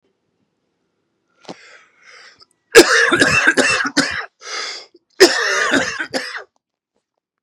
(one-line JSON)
{"cough_length": "7.4 s", "cough_amplitude": 32768, "cough_signal_mean_std_ratio": 0.42, "survey_phase": "beta (2021-08-13 to 2022-03-07)", "age": "45-64", "gender": "Male", "wearing_mask": "No", "symptom_runny_or_blocked_nose": true, "symptom_sore_throat": true, "symptom_headache": true, "smoker_status": "Never smoked", "respiratory_condition_asthma": false, "respiratory_condition_other": false, "recruitment_source": "Test and Trace", "submission_delay": "2 days", "covid_test_result": "Positive", "covid_test_method": "RT-qPCR", "covid_ct_value": 24.3, "covid_ct_gene": "ORF1ab gene", "covid_ct_mean": 25.3, "covid_viral_load": "5100 copies/ml", "covid_viral_load_category": "Minimal viral load (< 10K copies/ml)"}